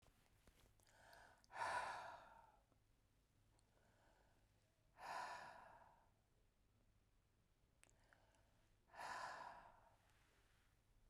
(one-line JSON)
{"exhalation_length": "11.1 s", "exhalation_amplitude": 682, "exhalation_signal_mean_std_ratio": 0.42, "survey_phase": "beta (2021-08-13 to 2022-03-07)", "age": "65+", "gender": "Female", "wearing_mask": "No", "symptom_none": true, "smoker_status": "Ex-smoker", "respiratory_condition_asthma": false, "respiratory_condition_other": false, "recruitment_source": "Test and Trace", "submission_delay": "2 days", "covid_test_result": "Negative", "covid_test_method": "RT-qPCR"}